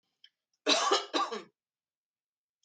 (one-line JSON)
{"cough_length": "2.6 s", "cough_amplitude": 7862, "cough_signal_mean_std_ratio": 0.37, "survey_phase": "alpha (2021-03-01 to 2021-08-12)", "age": "45-64", "gender": "Female", "wearing_mask": "No", "symptom_none": true, "smoker_status": "Never smoked", "respiratory_condition_asthma": false, "respiratory_condition_other": false, "recruitment_source": "REACT", "submission_delay": "2 days", "covid_test_result": "Negative", "covid_test_method": "RT-qPCR"}